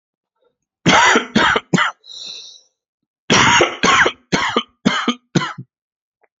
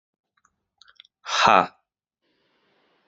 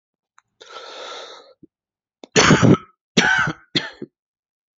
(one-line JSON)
{"cough_length": "6.4 s", "cough_amplitude": 30745, "cough_signal_mean_std_ratio": 0.49, "exhalation_length": "3.1 s", "exhalation_amplitude": 28437, "exhalation_signal_mean_std_ratio": 0.23, "three_cough_length": "4.8 s", "three_cough_amplitude": 30180, "three_cough_signal_mean_std_ratio": 0.35, "survey_phase": "alpha (2021-03-01 to 2021-08-12)", "age": "18-44", "gender": "Male", "wearing_mask": "No", "symptom_cough_any": true, "symptom_new_continuous_cough": true, "symptom_shortness_of_breath": true, "symptom_diarrhoea": true, "symptom_fatigue": true, "symptom_fever_high_temperature": true, "symptom_onset": "3 days", "smoker_status": "Current smoker (1 to 10 cigarettes per day)", "respiratory_condition_asthma": false, "respiratory_condition_other": false, "recruitment_source": "Test and Trace", "submission_delay": "1 day", "covid_test_result": "Positive", "covid_test_method": "RT-qPCR"}